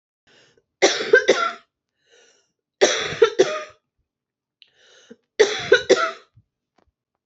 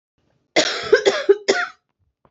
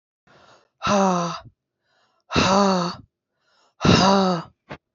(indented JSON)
{
  "three_cough_length": "7.3 s",
  "three_cough_amplitude": 27622,
  "three_cough_signal_mean_std_ratio": 0.34,
  "cough_length": "2.3 s",
  "cough_amplitude": 28477,
  "cough_signal_mean_std_ratio": 0.43,
  "exhalation_length": "4.9 s",
  "exhalation_amplitude": 24016,
  "exhalation_signal_mean_std_ratio": 0.47,
  "survey_phase": "beta (2021-08-13 to 2022-03-07)",
  "age": "18-44",
  "gender": "Female",
  "wearing_mask": "No",
  "symptom_cough_any": true,
  "symptom_runny_or_blocked_nose": true,
  "symptom_fatigue": true,
  "symptom_change_to_sense_of_smell_or_taste": true,
  "symptom_loss_of_taste": true,
  "smoker_status": "Current smoker (e-cigarettes or vapes only)",
  "respiratory_condition_asthma": false,
  "respiratory_condition_other": false,
  "recruitment_source": "Test and Trace",
  "submission_delay": "2 days",
  "covid_test_result": "Positive",
  "covid_test_method": "RT-qPCR",
  "covid_ct_value": 16.6,
  "covid_ct_gene": "S gene",
  "covid_ct_mean": 17.0,
  "covid_viral_load": "2700000 copies/ml",
  "covid_viral_load_category": "High viral load (>1M copies/ml)"
}